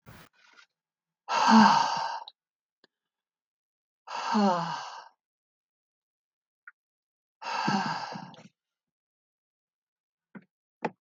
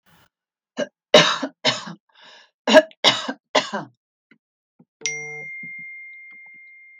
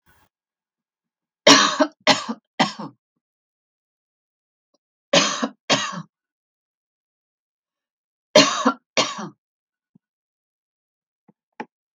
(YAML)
exhalation_length: 11.0 s
exhalation_amplitude: 15331
exhalation_signal_mean_std_ratio: 0.32
cough_length: 7.0 s
cough_amplitude: 32768
cough_signal_mean_std_ratio: 0.31
three_cough_length: 11.9 s
three_cough_amplitude: 32768
three_cough_signal_mean_std_ratio: 0.26
survey_phase: beta (2021-08-13 to 2022-03-07)
age: 65+
gender: Female
wearing_mask: 'No'
symptom_none: true
smoker_status: Never smoked
respiratory_condition_asthma: false
respiratory_condition_other: false
recruitment_source: REACT
submission_delay: 3 days
covid_test_result: Negative
covid_test_method: RT-qPCR
influenza_a_test_result: Unknown/Void
influenza_b_test_result: Unknown/Void